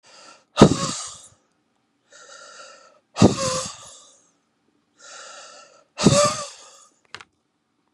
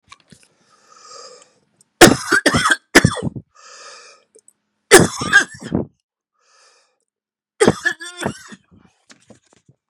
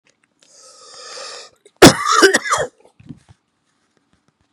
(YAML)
exhalation_length: 7.9 s
exhalation_amplitude: 32768
exhalation_signal_mean_std_ratio: 0.28
three_cough_length: 9.9 s
three_cough_amplitude: 32768
three_cough_signal_mean_std_ratio: 0.29
cough_length: 4.5 s
cough_amplitude: 32768
cough_signal_mean_std_ratio: 0.29
survey_phase: beta (2021-08-13 to 2022-03-07)
age: 18-44
gender: Male
wearing_mask: 'No'
symptom_cough_any: true
symptom_new_continuous_cough: true
symptom_shortness_of_breath: true
symptom_diarrhoea: true
symptom_fatigue: true
symptom_fever_high_temperature: true
symptom_change_to_sense_of_smell_or_taste: true
symptom_loss_of_taste: true
symptom_onset: 2 days
smoker_status: Current smoker (e-cigarettes or vapes only)
respiratory_condition_asthma: false
respiratory_condition_other: false
recruitment_source: Test and Trace
submission_delay: 2 days
covid_test_result: Positive
covid_test_method: RT-qPCR
covid_ct_value: 15.3
covid_ct_gene: ORF1ab gene
covid_ct_mean: 15.5
covid_viral_load: 8100000 copies/ml
covid_viral_load_category: High viral load (>1M copies/ml)